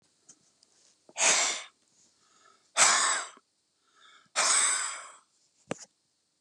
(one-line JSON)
{"exhalation_length": "6.4 s", "exhalation_amplitude": 14170, "exhalation_signal_mean_std_ratio": 0.4, "survey_phase": "beta (2021-08-13 to 2022-03-07)", "age": "65+", "gender": "Male", "wearing_mask": "No", "symptom_none": true, "smoker_status": "Ex-smoker", "respiratory_condition_asthma": false, "respiratory_condition_other": false, "recruitment_source": "REACT", "submission_delay": "2 days", "covid_test_result": "Negative", "covid_test_method": "RT-qPCR", "influenza_a_test_result": "Negative", "influenza_b_test_result": "Negative"}